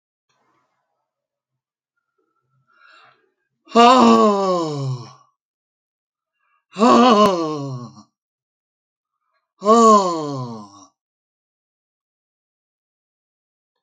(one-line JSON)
{"exhalation_length": "13.8 s", "exhalation_amplitude": 29101, "exhalation_signal_mean_std_ratio": 0.34, "survey_phase": "alpha (2021-03-01 to 2021-08-12)", "age": "65+", "gender": "Male", "wearing_mask": "No", "symptom_none": true, "smoker_status": "Ex-smoker", "respiratory_condition_asthma": true, "respiratory_condition_other": true, "recruitment_source": "REACT", "submission_delay": "2 days", "covid_test_result": "Negative", "covid_test_method": "RT-qPCR"}